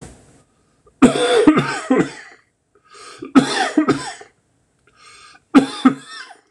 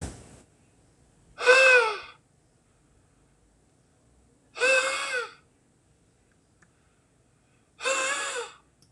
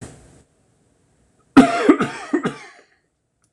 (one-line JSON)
{"three_cough_length": "6.5 s", "three_cough_amplitude": 26028, "three_cough_signal_mean_std_ratio": 0.41, "exhalation_length": "8.9 s", "exhalation_amplitude": 17871, "exhalation_signal_mean_std_ratio": 0.33, "cough_length": "3.5 s", "cough_amplitude": 26028, "cough_signal_mean_std_ratio": 0.31, "survey_phase": "beta (2021-08-13 to 2022-03-07)", "age": "45-64", "gender": "Male", "wearing_mask": "No", "symptom_runny_or_blocked_nose": true, "symptom_shortness_of_breath": true, "symptom_headache": true, "symptom_change_to_sense_of_smell_or_taste": true, "symptom_loss_of_taste": true, "smoker_status": "Ex-smoker", "respiratory_condition_asthma": true, "respiratory_condition_other": false, "recruitment_source": "Test and Trace", "submission_delay": "1 day", "covid_test_result": "Positive", "covid_test_method": "RT-qPCR"}